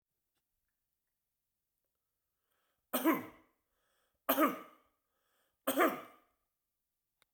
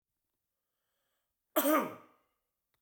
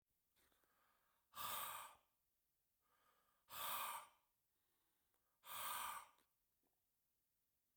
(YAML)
three_cough_length: 7.3 s
three_cough_amplitude: 6919
three_cough_signal_mean_std_ratio: 0.26
cough_length: 2.8 s
cough_amplitude: 5811
cough_signal_mean_std_ratio: 0.27
exhalation_length: 7.8 s
exhalation_amplitude: 549
exhalation_signal_mean_std_ratio: 0.4
survey_phase: beta (2021-08-13 to 2022-03-07)
age: 45-64
gender: Male
wearing_mask: 'No'
symptom_sore_throat: true
symptom_fatigue: true
symptom_headache: true
symptom_onset: 2 days
smoker_status: Never smoked
respiratory_condition_asthma: true
respiratory_condition_other: false
recruitment_source: Test and Trace
submission_delay: 2 days
covid_test_result: Positive
covid_test_method: RT-qPCR